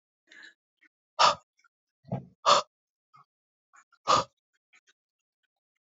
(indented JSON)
{
  "exhalation_length": "5.9 s",
  "exhalation_amplitude": 14937,
  "exhalation_signal_mean_std_ratio": 0.23,
  "survey_phase": "beta (2021-08-13 to 2022-03-07)",
  "age": "18-44",
  "gender": "Male",
  "wearing_mask": "No",
  "symptom_none": true,
  "symptom_onset": "8 days",
  "smoker_status": "Never smoked",
  "respiratory_condition_asthma": false,
  "respiratory_condition_other": false,
  "recruitment_source": "REACT",
  "submission_delay": "1 day",
  "covid_test_result": "Negative",
  "covid_test_method": "RT-qPCR",
  "influenza_a_test_result": "Negative",
  "influenza_b_test_result": "Negative"
}